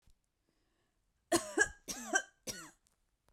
three_cough_length: 3.3 s
three_cough_amplitude: 5738
three_cough_signal_mean_std_ratio: 0.3
survey_phase: beta (2021-08-13 to 2022-03-07)
age: 18-44
gender: Female
wearing_mask: 'No'
symptom_shortness_of_breath: true
symptom_sore_throat: true
symptom_fatigue: true
symptom_other: true
symptom_onset: 4 days
smoker_status: Never smoked
respiratory_condition_asthma: false
respiratory_condition_other: false
recruitment_source: Test and Trace
submission_delay: 2 days
covid_test_result: Positive
covid_test_method: RT-qPCR
covid_ct_value: 27.6
covid_ct_gene: ORF1ab gene
covid_ct_mean: 28.0
covid_viral_load: 640 copies/ml
covid_viral_load_category: Minimal viral load (< 10K copies/ml)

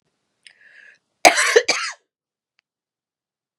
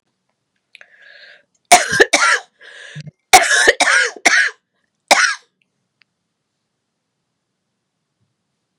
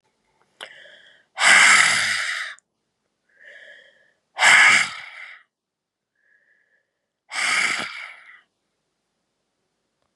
cough_length: 3.6 s
cough_amplitude: 32768
cough_signal_mean_std_ratio: 0.26
three_cough_length: 8.8 s
three_cough_amplitude: 32768
three_cough_signal_mean_std_ratio: 0.34
exhalation_length: 10.2 s
exhalation_amplitude: 30523
exhalation_signal_mean_std_ratio: 0.35
survey_phase: beta (2021-08-13 to 2022-03-07)
age: 45-64
gender: Female
wearing_mask: 'No'
symptom_cough_any: true
symptom_runny_or_blocked_nose: true
symptom_fatigue: true
symptom_headache: true
symptom_onset: 4 days
smoker_status: Never smoked
respiratory_condition_asthma: false
respiratory_condition_other: false
recruitment_source: Test and Trace
submission_delay: 1 day
covid_test_result: Positive
covid_test_method: RT-qPCR
covid_ct_value: 12.5
covid_ct_gene: ORF1ab gene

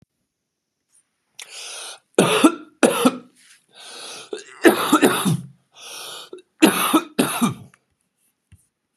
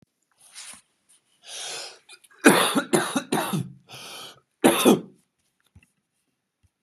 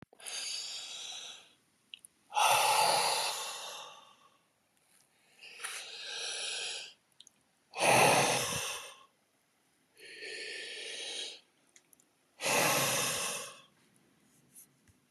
three_cough_length: 9.0 s
three_cough_amplitude: 32349
three_cough_signal_mean_std_ratio: 0.39
cough_length: 6.8 s
cough_amplitude: 31775
cough_signal_mean_std_ratio: 0.34
exhalation_length: 15.1 s
exhalation_amplitude: 7477
exhalation_signal_mean_std_ratio: 0.49
survey_phase: beta (2021-08-13 to 2022-03-07)
age: 45-64
gender: Male
wearing_mask: 'No'
symptom_loss_of_taste: true
symptom_onset: 12 days
smoker_status: Never smoked
respiratory_condition_asthma: false
respiratory_condition_other: false
recruitment_source: REACT
submission_delay: 0 days
covid_test_result: Negative
covid_test_method: RT-qPCR
covid_ct_value: 39.0
covid_ct_gene: N gene
influenza_a_test_result: Unknown/Void
influenza_b_test_result: Unknown/Void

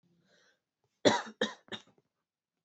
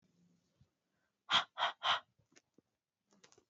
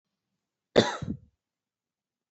three_cough_length: 2.6 s
three_cough_amplitude: 10974
three_cough_signal_mean_std_ratio: 0.24
exhalation_length: 3.5 s
exhalation_amplitude: 4320
exhalation_signal_mean_std_ratio: 0.27
cough_length: 2.3 s
cough_amplitude: 18906
cough_signal_mean_std_ratio: 0.22
survey_phase: beta (2021-08-13 to 2022-03-07)
age: 18-44
gender: Female
wearing_mask: 'No'
symptom_none: true
smoker_status: Never smoked
respiratory_condition_asthma: false
respiratory_condition_other: false
recruitment_source: REACT
submission_delay: 5 days
covid_test_result: Negative
covid_test_method: RT-qPCR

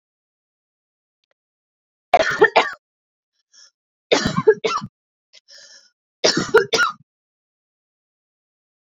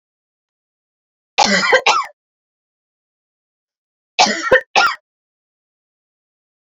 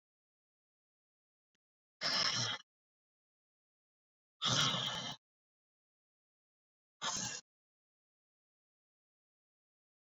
three_cough_length: 9.0 s
three_cough_amplitude: 29742
three_cough_signal_mean_std_ratio: 0.29
cough_length: 6.7 s
cough_amplitude: 32410
cough_signal_mean_std_ratio: 0.32
exhalation_length: 10.1 s
exhalation_amplitude: 4292
exhalation_signal_mean_std_ratio: 0.31
survey_phase: beta (2021-08-13 to 2022-03-07)
age: 18-44
gender: Female
wearing_mask: 'Yes'
symptom_runny_or_blocked_nose: true
symptom_sore_throat: true
symptom_fatigue: true
symptom_fever_high_temperature: true
symptom_headache: true
smoker_status: Current smoker (1 to 10 cigarettes per day)
respiratory_condition_asthma: false
respiratory_condition_other: false
recruitment_source: Test and Trace
submission_delay: 1 day
covid_test_result: Positive
covid_test_method: RT-qPCR
covid_ct_value: 15.0
covid_ct_gene: ORF1ab gene
covid_ct_mean: 15.3
covid_viral_load: 9300000 copies/ml
covid_viral_load_category: High viral load (>1M copies/ml)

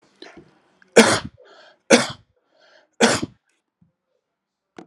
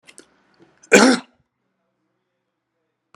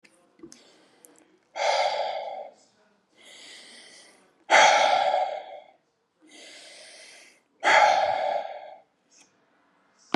three_cough_length: 4.9 s
three_cough_amplitude: 32768
three_cough_signal_mean_std_ratio: 0.26
cough_length: 3.2 s
cough_amplitude: 32768
cough_signal_mean_std_ratio: 0.22
exhalation_length: 10.2 s
exhalation_amplitude: 21282
exhalation_signal_mean_std_ratio: 0.41
survey_phase: alpha (2021-03-01 to 2021-08-12)
age: 45-64
gender: Male
wearing_mask: 'No'
symptom_none: true
smoker_status: Never smoked
respiratory_condition_asthma: false
respiratory_condition_other: false
recruitment_source: REACT
submission_delay: 1 day
covid_test_result: Negative
covid_test_method: RT-qPCR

